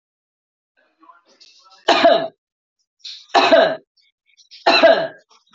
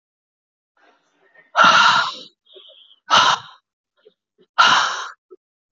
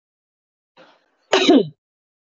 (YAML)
three_cough_length: 5.5 s
three_cough_amplitude: 26731
three_cough_signal_mean_std_ratio: 0.38
exhalation_length: 5.7 s
exhalation_amplitude: 26286
exhalation_signal_mean_std_ratio: 0.38
cough_length: 2.2 s
cough_amplitude: 25237
cough_signal_mean_std_ratio: 0.31
survey_phase: alpha (2021-03-01 to 2021-08-12)
age: 18-44
gender: Female
wearing_mask: 'No'
symptom_fever_high_temperature: true
symptom_headache: true
symptom_change_to_sense_of_smell_or_taste: true
symptom_loss_of_taste: true
smoker_status: Ex-smoker
respiratory_condition_asthma: false
respiratory_condition_other: false
recruitment_source: Test and Trace
submission_delay: 2 days
covid_test_result: Positive
covid_test_method: RT-qPCR
covid_ct_value: 16.6
covid_ct_gene: ORF1ab gene
covid_ct_mean: 16.9
covid_viral_load: 3000000 copies/ml
covid_viral_load_category: High viral load (>1M copies/ml)